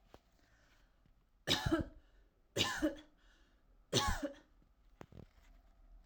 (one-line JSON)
{"three_cough_length": "6.1 s", "three_cough_amplitude": 4419, "three_cough_signal_mean_std_ratio": 0.37, "survey_phase": "alpha (2021-03-01 to 2021-08-12)", "age": "18-44", "gender": "Female", "wearing_mask": "No", "symptom_fatigue": true, "symptom_onset": "12 days", "smoker_status": "Never smoked", "respiratory_condition_asthma": true, "respiratory_condition_other": false, "recruitment_source": "REACT", "submission_delay": "1 day", "covid_test_result": "Negative", "covid_test_method": "RT-qPCR"}